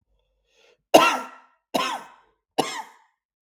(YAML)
three_cough_length: 3.4 s
three_cough_amplitude: 32766
three_cough_signal_mean_std_ratio: 0.29
survey_phase: beta (2021-08-13 to 2022-03-07)
age: 45-64
gender: Male
wearing_mask: 'No'
symptom_none: true
smoker_status: Never smoked
respiratory_condition_asthma: false
respiratory_condition_other: false
recruitment_source: REACT
submission_delay: 1 day
covid_test_result: Negative
covid_test_method: RT-qPCR